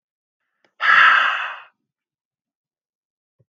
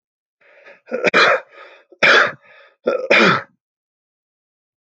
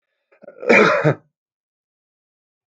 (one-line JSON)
{"exhalation_length": "3.6 s", "exhalation_amplitude": 27689, "exhalation_signal_mean_std_ratio": 0.33, "three_cough_length": "4.9 s", "three_cough_amplitude": 30369, "three_cough_signal_mean_std_ratio": 0.4, "cough_length": "2.7 s", "cough_amplitude": 29184, "cough_signal_mean_std_ratio": 0.33, "survey_phase": "alpha (2021-03-01 to 2021-08-12)", "age": "45-64", "gender": "Male", "wearing_mask": "No", "symptom_none": true, "smoker_status": "Never smoked", "respiratory_condition_asthma": false, "respiratory_condition_other": false, "recruitment_source": "REACT", "submission_delay": "5 days", "covid_test_result": "Negative", "covid_test_method": "RT-qPCR"}